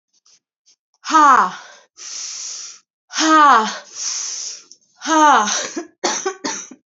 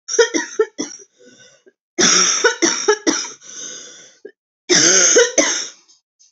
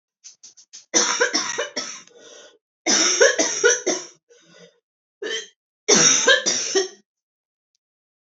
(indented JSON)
{
  "exhalation_length": "7.0 s",
  "exhalation_amplitude": 29638,
  "exhalation_signal_mean_std_ratio": 0.48,
  "cough_length": "6.3 s",
  "cough_amplitude": 32203,
  "cough_signal_mean_std_ratio": 0.53,
  "three_cough_length": "8.3 s",
  "three_cough_amplitude": 29718,
  "three_cough_signal_mean_std_ratio": 0.47,
  "survey_phase": "beta (2021-08-13 to 2022-03-07)",
  "age": "18-44",
  "gender": "Female",
  "wearing_mask": "Yes",
  "symptom_cough_any": true,
  "symptom_new_continuous_cough": true,
  "symptom_runny_or_blocked_nose": true,
  "symptom_onset": "10 days",
  "smoker_status": "Never smoked",
  "respiratory_condition_asthma": false,
  "respiratory_condition_other": false,
  "recruitment_source": "Test and Trace",
  "submission_delay": "2 days",
  "covid_test_result": "Negative",
  "covid_test_method": "ePCR"
}